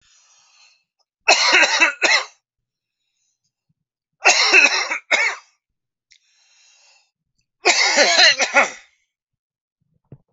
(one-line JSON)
{"three_cough_length": "10.3 s", "three_cough_amplitude": 32768, "three_cough_signal_mean_std_ratio": 0.41, "survey_phase": "alpha (2021-03-01 to 2021-08-12)", "age": "45-64", "gender": "Male", "wearing_mask": "No", "symptom_cough_any": true, "smoker_status": "Never smoked", "respiratory_condition_asthma": false, "respiratory_condition_other": false, "recruitment_source": "REACT", "submission_delay": "8 days", "covid_test_result": "Negative", "covid_test_method": "RT-qPCR"}